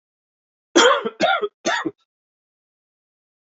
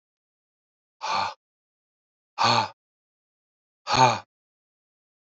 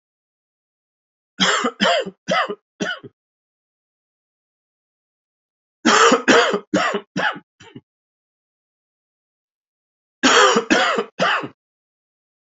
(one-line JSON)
{"cough_length": "3.5 s", "cough_amplitude": 27708, "cough_signal_mean_std_ratio": 0.36, "exhalation_length": "5.3 s", "exhalation_amplitude": 19438, "exhalation_signal_mean_std_ratio": 0.3, "three_cough_length": "12.5 s", "three_cough_amplitude": 29505, "three_cough_signal_mean_std_ratio": 0.38, "survey_phase": "beta (2021-08-13 to 2022-03-07)", "age": "45-64", "gender": "Male", "wearing_mask": "No", "symptom_cough_any": true, "symptom_runny_or_blocked_nose": true, "symptom_onset": "2 days", "smoker_status": "Never smoked", "respiratory_condition_asthma": false, "respiratory_condition_other": false, "recruitment_source": "Test and Trace", "submission_delay": "1 day", "covid_test_result": "Positive", "covid_test_method": "RT-qPCR", "covid_ct_value": 20.3, "covid_ct_gene": "N gene"}